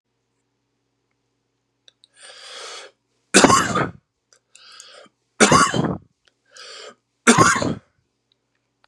{"three_cough_length": "8.9 s", "three_cough_amplitude": 32768, "three_cough_signal_mean_std_ratio": 0.32, "survey_phase": "beta (2021-08-13 to 2022-03-07)", "age": "18-44", "gender": "Male", "wearing_mask": "No", "symptom_cough_any": true, "symptom_runny_or_blocked_nose": true, "symptom_fatigue": true, "symptom_headache": true, "symptom_change_to_sense_of_smell_or_taste": true, "symptom_onset": "3 days", "smoker_status": "Ex-smoker", "respiratory_condition_asthma": false, "respiratory_condition_other": false, "recruitment_source": "Test and Trace", "submission_delay": "2 days", "covid_test_result": "Positive", "covid_test_method": "RT-qPCR", "covid_ct_value": 23.4, "covid_ct_gene": "ORF1ab gene"}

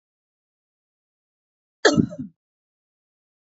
{"cough_length": "3.5 s", "cough_amplitude": 25375, "cough_signal_mean_std_ratio": 0.19, "survey_phase": "beta (2021-08-13 to 2022-03-07)", "age": "45-64", "gender": "Female", "wearing_mask": "No", "symptom_none": true, "smoker_status": "Ex-smoker", "respiratory_condition_asthma": false, "respiratory_condition_other": false, "recruitment_source": "REACT", "submission_delay": "1 day", "covid_test_result": "Negative", "covid_test_method": "RT-qPCR", "influenza_a_test_result": "Unknown/Void", "influenza_b_test_result": "Unknown/Void"}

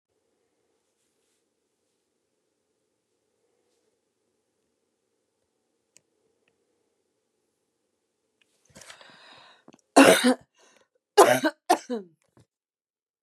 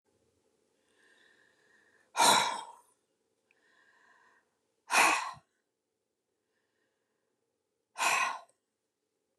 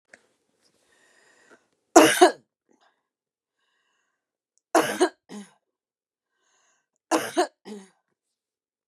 {"cough_length": "13.2 s", "cough_amplitude": 27858, "cough_signal_mean_std_ratio": 0.18, "exhalation_length": "9.4 s", "exhalation_amplitude": 9426, "exhalation_signal_mean_std_ratio": 0.27, "three_cough_length": "8.9 s", "three_cough_amplitude": 32767, "three_cough_signal_mean_std_ratio": 0.22, "survey_phase": "beta (2021-08-13 to 2022-03-07)", "age": "65+", "gender": "Female", "wearing_mask": "No", "symptom_cough_any": true, "symptom_runny_or_blocked_nose": true, "symptom_onset": "6 days", "smoker_status": "Ex-smoker", "respiratory_condition_asthma": false, "respiratory_condition_other": false, "recruitment_source": "REACT", "submission_delay": "1 day", "covid_test_result": "Negative", "covid_test_method": "RT-qPCR", "influenza_a_test_result": "Unknown/Void", "influenza_b_test_result": "Unknown/Void"}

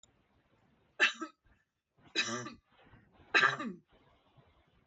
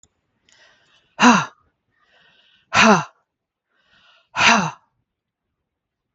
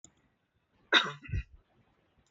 {"three_cough_length": "4.9 s", "three_cough_amplitude": 7502, "three_cough_signal_mean_std_ratio": 0.29, "exhalation_length": "6.1 s", "exhalation_amplitude": 32766, "exhalation_signal_mean_std_ratio": 0.29, "cough_length": "2.3 s", "cough_amplitude": 13143, "cough_signal_mean_std_ratio": 0.26, "survey_phase": "beta (2021-08-13 to 2022-03-07)", "age": "45-64", "gender": "Female", "wearing_mask": "No", "symptom_none": true, "smoker_status": "Ex-smoker", "respiratory_condition_asthma": false, "respiratory_condition_other": false, "recruitment_source": "REACT", "submission_delay": "5 days", "covid_test_result": "Negative", "covid_test_method": "RT-qPCR", "influenza_a_test_result": "Negative", "influenza_b_test_result": "Negative"}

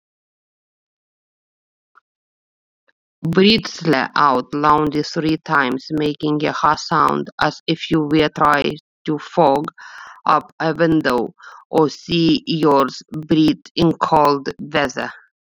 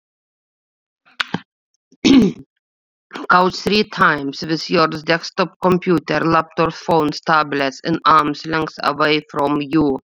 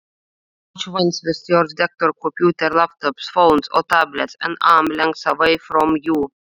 {"exhalation_length": "15.4 s", "exhalation_amplitude": 28617, "exhalation_signal_mean_std_ratio": 0.56, "three_cough_length": "10.1 s", "three_cough_amplitude": 32768, "three_cough_signal_mean_std_ratio": 0.57, "cough_length": "6.5 s", "cough_amplitude": 28714, "cough_signal_mean_std_ratio": 0.57, "survey_phase": "beta (2021-08-13 to 2022-03-07)", "age": "18-44", "gender": "Female", "wearing_mask": "No", "symptom_runny_or_blocked_nose": true, "symptom_sore_throat": true, "symptom_headache": true, "symptom_change_to_sense_of_smell_or_taste": true, "symptom_onset": "6 days", "smoker_status": "Ex-smoker", "recruitment_source": "Test and Trace", "submission_delay": "3 days", "covid_test_result": "Positive", "covid_test_method": "RT-qPCR", "covid_ct_value": 17.8, "covid_ct_gene": "S gene"}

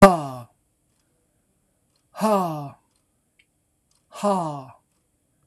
{"exhalation_length": "5.5 s", "exhalation_amplitude": 26028, "exhalation_signal_mean_std_ratio": 0.28, "survey_phase": "beta (2021-08-13 to 2022-03-07)", "age": "45-64", "gender": "Male", "wearing_mask": "No", "symptom_none": true, "smoker_status": "Never smoked", "respiratory_condition_asthma": false, "respiratory_condition_other": false, "recruitment_source": "REACT", "submission_delay": "2 days", "covid_test_result": "Negative", "covid_test_method": "RT-qPCR", "influenza_a_test_result": "Negative", "influenza_b_test_result": "Negative"}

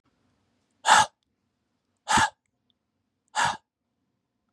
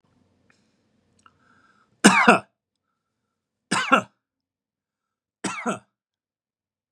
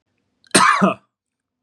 {"exhalation_length": "4.5 s", "exhalation_amplitude": 20036, "exhalation_signal_mean_std_ratio": 0.27, "three_cough_length": "6.9 s", "three_cough_amplitude": 32767, "three_cough_signal_mean_std_ratio": 0.23, "cough_length": "1.6 s", "cough_amplitude": 32767, "cough_signal_mean_std_ratio": 0.39, "survey_phase": "beta (2021-08-13 to 2022-03-07)", "age": "45-64", "gender": "Male", "wearing_mask": "No", "symptom_none": true, "symptom_onset": "6 days", "smoker_status": "Ex-smoker", "respiratory_condition_asthma": true, "respiratory_condition_other": false, "recruitment_source": "Test and Trace", "submission_delay": "3 days", "covid_test_result": "Negative", "covid_test_method": "RT-qPCR"}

